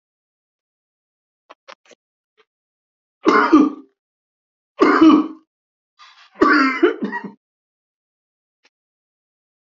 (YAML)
three_cough_length: 9.6 s
three_cough_amplitude: 30209
three_cough_signal_mean_std_ratio: 0.32
survey_phase: beta (2021-08-13 to 2022-03-07)
age: 65+
gender: Male
wearing_mask: 'No'
symptom_cough_any: true
symptom_headache: true
symptom_loss_of_taste: true
symptom_onset: 6 days
smoker_status: Ex-smoker
respiratory_condition_asthma: true
respiratory_condition_other: false
recruitment_source: Test and Trace
submission_delay: 2 days
covid_test_result: Positive
covid_test_method: ePCR